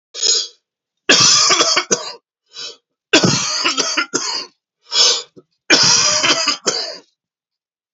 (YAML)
three_cough_length: 7.9 s
three_cough_amplitude: 32768
three_cough_signal_mean_std_ratio: 0.57
survey_phase: beta (2021-08-13 to 2022-03-07)
age: 65+
gender: Male
wearing_mask: 'No'
symptom_cough_any: true
symptom_onset: 5 days
smoker_status: Current smoker (1 to 10 cigarettes per day)
respiratory_condition_asthma: false
respiratory_condition_other: true
recruitment_source: REACT
submission_delay: 2 days
covid_test_result: Negative
covid_test_method: RT-qPCR
influenza_a_test_result: Negative
influenza_b_test_result: Negative